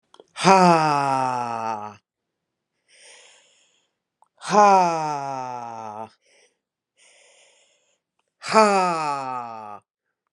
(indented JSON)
{
  "exhalation_length": "10.3 s",
  "exhalation_amplitude": 32507,
  "exhalation_signal_mean_std_ratio": 0.4,
  "survey_phase": "beta (2021-08-13 to 2022-03-07)",
  "age": "45-64",
  "gender": "Female",
  "wearing_mask": "No",
  "symptom_runny_or_blocked_nose": true,
  "symptom_fatigue": true,
  "symptom_change_to_sense_of_smell_or_taste": true,
  "symptom_onset": "3 days",
  "smoker_status": "Current smoker (1 to 10 cigarettes per day)",
  "respiratory_condition_asthma": false,
  "respiratory_condition_other": false,
  "recruitment_source": "Test and Trace",
  "submission_delay": "2 days",
  "covid_test_result": "Positive",
  "covid_test_method": "RT-qPCR",
  "covid_ct_value": 18.4,
  "covid_ct_gene": "N gene"
}